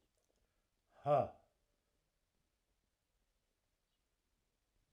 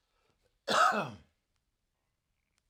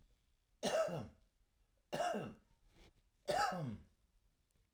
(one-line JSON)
{"exhalation_length": "4.9 s", "exhalation_amplitude": 2469, "exhalation_signal_mean_std_ratio": 0.18, "cough_length": "2.7 s", "cough_amplitude": 6239, "cough_signal_mean_std_ratio": 0.3, "three_cough_length": "4.7 s", "three_cough_amplitude": 1919, "three_cough_signal_mean_std_ratio": 0.45, "survey_phase": "alpha (2021-03-01 to 2021-08-12)", "age": "65+", "gender": "Male", "wearing_mask": "No", "symptom_cough_any": true, "symptom_headache": true, "symptom_onset": "12 days", "smoker_status": "Ex-smoker", "respiratory_condition_asthma": false, "respiratory_condition_other": false, "recruitment_source": "REACT", "submission_delay": "2 days", "covid_test_result": "Negative", "covid_test_method": "RT-qPCR"}